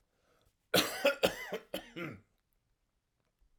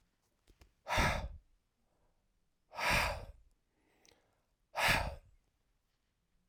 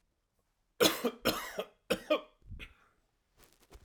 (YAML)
cough_length: 3.6 s
cough_amplitude: 8358
cough_signal_mean_std_ratio: 0.33
exhalation_length: 6.5 s
exhalation_amplitude: 4809
exhalation_signal_mean_std_ratio: 0.36
three_cough_length: 3.8 s
three_cough_amplitude: 8050
three_cough_signal_mean_std_ratio: 0.34
survey_phase: alpha (2021-03-01 to 2021-08-12)
age: 45-64
gender: Male
wearing_mask: 'No'
symptom_none: true
smoker_status: Ex-smoker
respiratory_condition_asthma: false
respiratory_condition_other: false
recruitment_source: REACT
submission_delay: 1 day
covid_test_result: Negative
covid_test_method: RT-qPCR